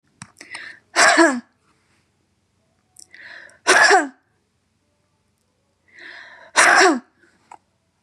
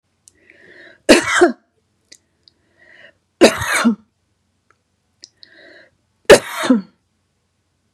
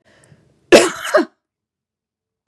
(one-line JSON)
{"exhalation_length": "8.0 s", "exhalation_amplitude": 31674, "exhalation_signal_mean_std_ratio": 0.34, "three_cough_length": "7.9 s", "three_cough_amplitude": 32768, "three_cough_signal_mean_std_ratio": 0.28, "cough_length": "2.5 s", "cough_amplitude": 32768, "cough_signal_mean_std_ratio": 0.28, "survey_phase": "beta (2021-08-13 to 2022-03-07)", "age": "65+", "gender": "Female", "wearing_mask": "No", "symptom_none": true, "smoker_status": "Never smoked", "respiratory_condition_asthma": false, "respiratory_condition_other": false, "recruitment_source": "REACT", "submission_delay": "1 day", "covid_test_result": "Negative", "covid_test_method": "RT-qPCR", "influenza_a_test_result": "Negative", "influenza_b_test_result": "Negative"}